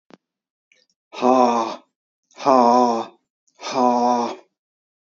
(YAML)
exhalation_length: 5.0 s
exhalation_amplitude: 29933
exhalation_signal_mean_std_ratio: 0.46
survey_phase: beta (2021-08-13 to 2022-03-07)
age: 45-64
gender: Male
wearing_mask: 'No'
symptom_none: true
smoker_status: Never smoked
respiratory_condition_asthma: false
respiratory_condition_other: false
recruitment_source: REACT
submission_delay: 2 days
covid_test_result: Negative
covid_test_method: RT-qPCR
influenza_a_test_result: Negative
influenza_b_test_result: Negative